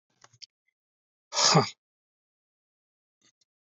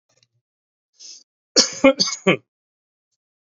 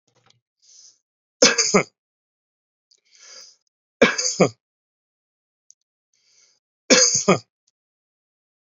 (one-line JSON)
{"exhalation_length": "3.7 s", "exhalation_amplitude": 13269, "exhalation_signal_mean_std_ratio": 0.23, "cough_length": "3.6 s", "cough_amplitude": 30823, "cough_signal_mean_std_ratio": 0.26, "three_cough_length": "8.6 s", "three_cough_amplitude": 32351, "three_cough_signal_mean_std_ratio": 0.27, "survey_phase": "alpha (2021-03-01 to 2021-08-12)", "age": "45-64", "gender": "Male", "wearing_mask": "No", "symptom_none": true, "smoker_status": "Ex-smoker", "respiratory_condition_asthma": false, "respiratory_condition_other": false, "recruitment_source": "REACT", "submission_delay": "1 day", "covid_test_result": "Negative", "covid_test_method": "RT-qPCR"}